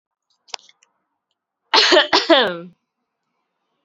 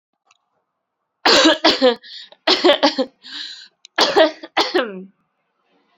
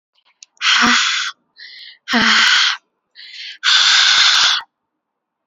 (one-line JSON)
{"cough_length": "3.8 s", "cough_amplitude": 32767, "cough_signal_mean_std_ratio": 0.34, "three_cough_length": "6.0 s", "three_cough_amplitude": 32415, "three_cough_signal_mean_std_ratio": 0.44, "exhalation_length": "5.5 s", "exhalation_amplitude": 32767, "exhalation_signal_mean_std_ratio": 0.6, "survey_phase": "alpha (2021-03-01 to 2021-08-12)", "age": "18-44", "gender": "Female", "wearing_mask": "No", "symptom_fatigue": true, "symptom_headache": true, "smoker_status": "Prefer not to say", "respiratory_condition_asthma": false, "respiratory_condition_other": false, "recruitment_source": "Test and Trace", "submission_delay": "1 day", "covid_test_result": "Positive", "covid_test_method": "RT-qPCR", "covid_ct_value": 26.2, "covid_ct_gene": "ORF1ab gene", "covid_ct_mean": 26.8, "covid_viral_load": "1600 copies/ml", "covid_viral_load_category": "Minimal viral load (< 10K copies/ml)"}